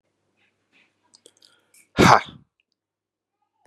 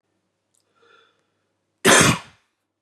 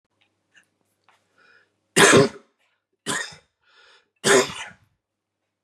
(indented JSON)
{
  "exhalation_length": "3.7 s",
  "exhalation_amplitude": 32767,
  "exhalation_signal_mean_std_ratio": 0.19,
  "cough_length": "2.8 s",
  "cough_amplitude": 32182,
  "cough_signal_mean_std_ratio": 0.27,
  "three_cough_length": "5.6 s",
  "three_cough_amplitude": 29453,
  "three_cough_signal_mean_std_ratio": 0.28,
  "survey_phase": "beta (2021-08-13 to 2022-03-07)",
  "age": "18-44",
  "gender": "Male",
  "wearing_mask": "No",
  "symptom_runny_or_blocked_nose": true,
  "symptom_sore_throat": true,
  "smoker_status": "Never smoked",
  "respiratory_condition_asthma": false,
  "respiratory_condition_other": false,
  "recruitment_source": "REACT",
  "submission_delay": "3 days",
  "covid_test_result": "Negative",
  "covid_test_method": "RT-qPCR",
  "influenza_a_test_result": "Negative",
  "influenza_b_test_result": "Negative"
}